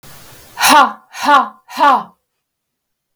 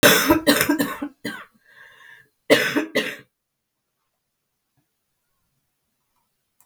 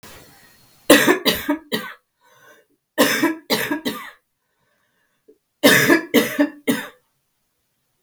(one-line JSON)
{"exhalation_length": "3.2 s", "exhalation_amplitude": 32768, "exhalation_signal_mean_std_ratio": 0.44, "cough_length": "6.7 s", "cough_amplitude": 32547, "cough_signal_mean_std_ratio": 0.34, "three_cough_length": "8.0 s", "three_cough_amplitude": 32766, "three_cough_signal_mean_std_ratio": 0.4, "survey_phase": "beta (2021-08-13 to 2022-03-07)", "age": "45-64", "gender": "Female", "wearing_mask": "No", "symptom_cough_any": true, "symptom_diarrhoea": true, "symptom_fatigue": true, "symptom_headache": true, "symptom_onset": "3 days", "smoker_status": "Never smoked", "respiratory_condition_asthma": false, "respiratory_condition_other": false, "recruitment_source": "Test and Trace", "submission_delay": "1 day", "covid_test_result": "Positive", "covid_test_method": "RT-qPCR", "covid_ct_value": 18.4, "covid_ct_gene": "N gene", "covid_ct_mean": 19.8, "covid_viral_load": "310000 copies/ml", "covid_viral_load_category": "Low viral load (10K-1M copies/ml)"}